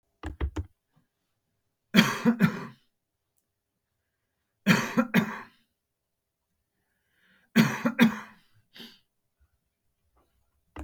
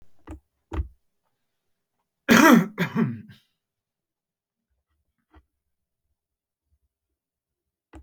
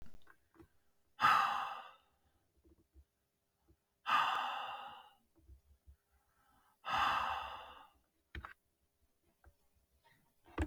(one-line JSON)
{"three_cough_length": "10.8 s", "three_cough_amplitude": 24243, "three_cough_signal_mean_std_ratio": 0.3, "cough_length": "8.0 s", "cough_amplitude": 32438, "cough_signal_mean_std_ratio": 0.23, "exhalation_length": "10.7 s", "exhalation_amplitude": 4186, "exhalation_signal_mean_std_ratio": 0.37, "survey_phase": "beta (2021-08-13 to 2022-03-07)", "age": "65+", "gender": "Male", "wearing_mask": "No", "symptom_cough_any": true, "smoker_status": "Prefer not to say", "respiratory_condition_asthma": false, "respiratory_condition_other": false, "recruitment_source": "REACT", "submission_delay": "6 days", "covid_test_result": "Negative", "covid_test_method": "RT-qPCR"}